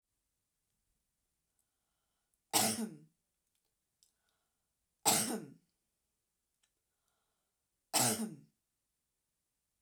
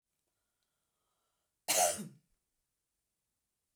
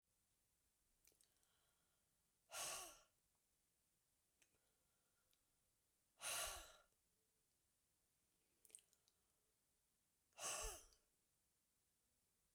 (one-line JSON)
{"three_cough_length": "9.8 s", "three_cough_amplitude": 7000, "three_cough_signal_mean_std_ratio": 0.25, "cough_length": "3.8 s", "cough_amplitude": 4732, "cough_signal_mean_std_ratio": 0.23, "exhalation_length": "12.5 s", "exhalation_amplitude": 614, "exhalation_signal_mean_std_ratio": 0.29, "survey_phase": "beta (2021-08-13 to 2022-03-07)", "age": "45-64", "gender": "Female", "wearing_mask": "No", "symptom_none": true, "symptom_onset": "10 days", "smoker_status": "Ex-smoker", "respiratory_condition_asthma": false, "respiratory_condition_other": false, "recruitment_source": "REACT", "submission_delay": "2 days", "covid_test_result": "Negative", "covid_test_method": "RT-qPCR"}